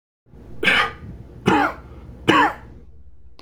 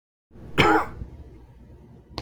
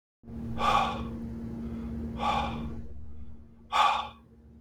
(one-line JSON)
{"three_cough_length": "3.4 s", "three_cough_amplitude": 32610, "three_cough_signal_mean_std_ratio": 0.49, "cough_length": "2.2 s", "cough_amplitude": 21536, "cough_signal_mean_std_ratio": 0.38, "exhalation_length": "4.6 s", "exhalation_amplitude": 9770, "exhalation_signal_mean_std_ratio": 0.72, "survey_phase": "beta (2021-08-13 to 2022-03-07)", "age": "45-64", "gender": "Male", "wearing_mask": "No", "symptom_none": true, "smoker_status": "Never smoked", "respiratory_condition_asthma": false, "respiratory_condition_other": false, "recruitment_source": "REACT", "submission_delay": "2 days", "covid_test_result": "Negative", "covid_test_method": "RT-qPCR", "influenza_a_test_result": "Negative", "influenza_b_test_result": "Negative"}